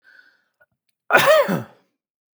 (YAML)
cough_length: 2.4 s
cough_amplitude: 32768
cough_signal_mean_std_ratio: 0.36
survey_phase: beta (2021-08-13 to 2022-03-07)
age: 45-64
gender: Male
wearing_mask: 'No'
symptom_none: true
symptom_onset: 12 days
smoker_status: Ex-smoker
respiratory_condition_asthma: false
respiratory_condition_other: false
recruitment_source: REACT
submission_delay: 1 day
covid_test_result: Negative
covid_test_method: RT-qPCR